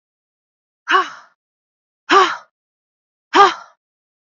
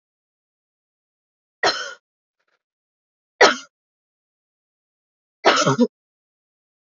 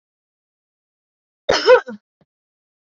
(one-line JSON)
{"exhalation_length": "4.3 s", "exhalation_amplitude": 28147, "exhalation_signal_mean_std_ratio": 0.29, "three_cough_length": "6.8 s", "three_cough_amplitude": 29508, "three_cough_signal_mean_std_ratio": 0.24, "cough_length": "2.8 s", "cough_amplitude": 27548, "cough_signal_mean_std_ratio": 0.24, "survey_phase": "beta (2021-08-13 to 2022-03-07)", "age": "18-44", "gender": "Female", "wearing_mask": "Yes", "symptom_runny_or_blocked_nose": true, "symptom_onset": "3 days", "smoker_status": "Never smoked", "respiratory_condition_asthma": false, "respiratory_condition_other": false, "recruitment_source": "Test and Trace", "submission_delay": "2 days", "covid_test_result": "Positive", "covid_test_method": "RT-qPCR"}